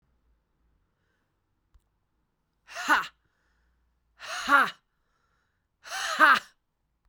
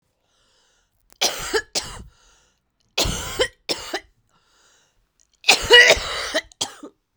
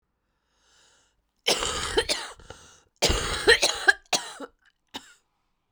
{"exhalation_length": "7.1 s", "exhalation_amplitude": 16900, "exhalation_signal_mean_std_ratio": 0.27, "three_cough_length": "7.2 s", "three_cough_amplitude": 32768, "three_cough_signal_mean_std_ratio": 0.33, "cough_length": "5.7 s", "cough_amplitude": 19666, "cough_signal_mean_std_ratio": 0.38, "survey_phase": "beta (2021-08-13 to 2022-03-07)", "age": "45-64", "gender": "Female", "wearing_mask": "Yes", "symptom_cough_any": true, "symptom_runny_or_blocked_nose": true, "symptom_fatigue": true, "symptom_headache": true, "symptom_change_to_sense_of_smell_or_taste": true, "symptom_loss_of_taste": true, "symptom_onset": "2 days", "smoker_status": "Never smoked", "respiratory_condition_asthma": false, "respiratory_condition_other": false, "recruitment_source": "Test and Trace", "submission_delay": "2 days", "covid_test_result": "Positive", "covid_test_method": "RT-qPCR", "covid_ct_value": 13.2, "covid_ct_gene": "ORF1ab gene", "covid_ct_mean": 13.5, "covid_viral_load": "38000000 copies/ml", "covid_viral_load_category": "High viral load (>1M copies/ml)"}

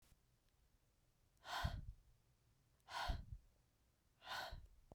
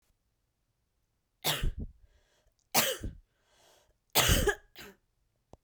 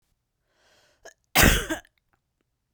{"exhalation_length": "4.9 s", "exhalation_amplitude": 1011, "exhalation_signal_mean_std_ratio": 0.43, "three_cough_length": "5.6 s", "three_cough_amplitude": 11961, "three_cough_signal_mean_std_ratio": 0.34, "cough_length": "2.7 s", "cough_amplitude": 23071, "cough_signal_mean_std_ratio": 0.27, "survey_phase": "beta (2021-08-13 to 2022-03-07)", "age": "18-44", "gender": "Female", "wearing_mask": "No", "symptom_runny_or_blocked_nose": true, "symptom_shortness_of_breath": true, "symptom_sore_throat": true, "symptom_fatigue": true, "symptom_fever_high_temperature": true, "symptom_headache": true, "symptom_change_to_sense_of_smell_or_taste": true, "symptom_loss_of_taste": true, "symptom_onset": "3 days", "smoker_status": "Never smoked", "respiratory_condition_asthma": false, "respiratory_condition_other": false, "recruitment_source": "Test and Trace", "submission_delay": "2 days", "covid_test_result": "Positive", "covid_test_method": "RT-qPCR"}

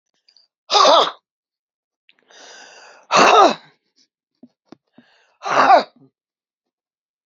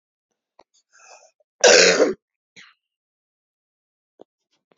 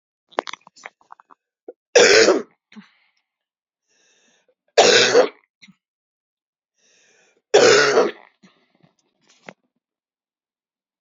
{"exhalation_length": "7.3 s", "exhalation_amplitude": 29576, "exhalation_signal_mean_std_ratio": 0.33, "cough_length": "4.8 s", "cough_amplitude": 32768, "cough_signal_mean_std_ratio": 0.25, "three_cough_length": "11.0 s", "three_cough_amplitude": 32768, "three_cough_signal_mean_std_ratio": 0.3, "survey_phase": "beta (2021-08-13 to 2022-03-07)", "age": "65+", "gender": "Female", "wearing_mask": "No", "symptom_cough_any": true, "symptom_runny_or_blocked_nose": true, "symptom_sore_throat": true, "symptom_fatigue": true, "symptom_headache": true, "smoker_status": "Never smoked", "respiratory_condition_asthma": false, "respiratory_condition_other": false, "recruitment_source": "Test and Trace", "submission_delay": "2 days", "covid_test_result": "Positive", "covid_test_method": "ePCR"}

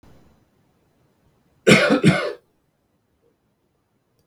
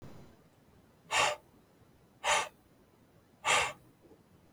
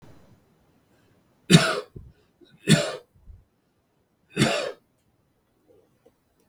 {"cough_length": "4.3 s", "cough_amplitude": 32768, "cough_signal_mean_std_ratio": 0.29, "exhalation_length": "4.5 s", "exhalation_amplitude": 6197, "exhalation_signal_mean_std_ratio": 0.36, "three_cough_length": "6.5 s", "three_cough_amplitude": 32768, "three_cough_signal_mean_std_ratio": 0.26, "survey_phase": "beta (2021-08-13 to 2022-03-07)", "age": "18-44", "gender": "Male", "wearing_mask": "No", "symptom_none": true, "smoker_status": "Ex-smoker", "respiratory_condition_asthma": false, "respiratory_condition_other": false, "recruitment_source": "REACT", "submission_delay": "0 days", "covid_test_result": "Negative", "covid_test_method": "RT-qPCR"}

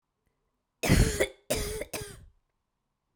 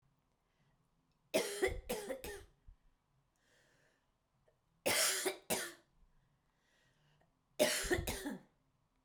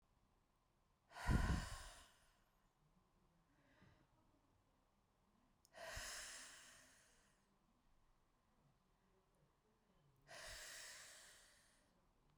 {"cough_length": "3.2 s", "cough_amplitude": 11487, "cough_signal_mean_std_ratio": 0.37, "three_cough_length": "9.0 s", "three_cough_amplitude": 4449, "three_cough_signal_mean_std_ratio": 0.38, "exhalation_length": "12.4 s", "exhalation_amplitude": 1596, "exhalation_signal_mean_std_ratio": 0.29, "survey_phase": "beta (2021-08-13 to 2022-03-07)", "age": "18-44", "gender": "Female", "wearing_mask": "No", "symptom_cough_any": true, "symptom_runny_or_blocked_nose": true, "symptom_sore_throat": true, "symptom_headache": true, "symptom_onset": "4 days", "smoker_status": "Never smoked", "respiratory_condition_asthma": false, "respiratory_condition_other": false, "recruitment_source": "Test and Trace", "submission_delay": "3 days", "covid_test_result": "Positive", "covid_test_method": "RT-qPCR", "covid_ct_value": 29.3, "covid_ct_gene": "N gene"}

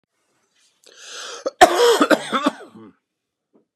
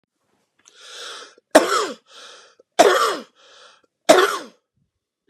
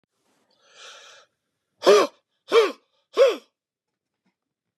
{"cough_length": "3.8 s", "cough_amplitude": 32768, "cough_signal_mean_std_ratio": 0.35, "three_cough_length": "5.3 s", "three_cough_amplitude": 32768, "three_cough_signal_mean_std_ratio": 0.33, "exhalation_length": "4.8 s", "exhalation_amplitude": 23275, "exhalation_signal_mean_std_ratio": 0.28, "survey_phase": "beta (2021-08-13 to 2022-03-07)", "age": "45-64", "gender": "Male", "wearing_mask": "No", "symptom_none": true, "symptom_onset": "2 days", "smoker_status": "Ex-smoker", "respiratory_condition_asthma": false, "respiratory_condition_other": false, "recruitment_source": "REACT", "submission_delay": "1 day", "covid_test_result": "Negative", "covid_test_method": "RT-qPCR"}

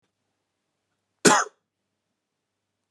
{"cough_length": "2.9 s", "cough_amplitude": 27679, "cough_signal_mean_std_ratio": 0.19, "survey_phase": "alpha (2021-03-01 to 2021-08-12)", "age": "18-44", "gender": "Male", "wearing_mask": "No", "symptom_none": true, "smoker_status": "Never smoked", "respiratory_condition_asthma": false, "respiratory_condition_other": false, "recruitment_source": "REACT", "submission_delay": "1 day", "covid_test_result": "Negative", "covid_test_method": "RT-qPCR"}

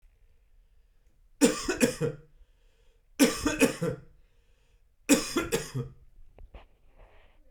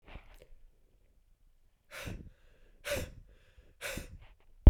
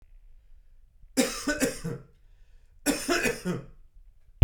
{"three_cough_length": "7.5 s", "three_cough_amplitude": 14122, "three_cough_signal_mean_std_ratio": 0.37, "exhalation_length": "4.7 s", "exhalation_amplitude": 18469, "exhalation_signal_mean_std_ratio": 0.16, "cough_length": "4.4 s", "cough_amplitude": 17661, "cough_signal_mean_std_ratio": 0.4, "survey_phase": "beta (2021-08-13 to 2022-03-07)", "age": "18-44", "gender": "Male", "wearing_mask": "No", "symptom_none": true, "smoker_status": "Never smoked", "respiratory_condition_asthma": false, "respiratory_condition_other": true, "recruitment_source": "REACT", "submission_delay": "1 day", "covid_test_result": "Negative", "covid_test_method": "RT-qPCR"}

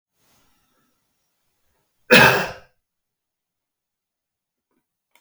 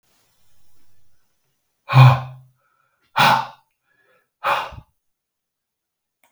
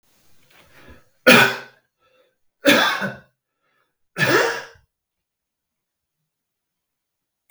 {"cough_length": "5.2 s", "cough_amplitude": 32768, "cough_signal_mean_std_ratio": 0.2, "exhalation_length": "6.3 s", "exhalation_amplitude": 32768, "exhalation_signal_mean_std_ratio": 0.27, "three_cough_length": "7.5 s", "three_cough_amplitude": 32768, "three_cough_signal_mean_std_ratio": 0.29, "survey_phase": "beta (2021-08-13 to 2022-03-07)", "age": "65+", "gender": "Male", "wearing_mask": "No", "symptom_none": true, "smoker_status": "Never smoked", "respiratory_condition_asthma": false, "respiratory_condition_other": false, "recruitment_source": "REACT", "submission_delay": "1 day", "covid_test_result": "Negative", "covid_test_method": "RT-qPCR"}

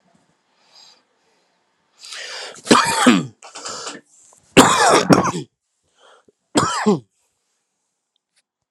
{"three_cough_length": "8.7 s", "three_cough_amplitude": 32768, "three_cough_signal_mean_std_ratio": 0.36, "survey_phase": "alpha (2021-03-01 to 2021-08-12)", "age": "45-64", "gender": "Male", "wearing_mask": "No", "symptom_new_continuous_cough": true, "symptom_fatigue": true, "symptom_headache": true, "symptom_onset": "8 days", "smoker_status": "Ex-smoker", "respiratory_condition_asthma": false, "respiratory_condition_other": true, "recruitment_source": "Test and Trace", "submission_delay": "2 days", "covid_test_result": "Positive", "covid_test_method": "RT-qPCR", "covid_ct_value": 21.7, "covid_ct_gene": "ORF1ab gene", "covid_ct_mean": 21.8, "covid_viral_load": "69000 copies/ml", "covid_viral_load_category": "Low viral load (10K-1M copies/ml)"}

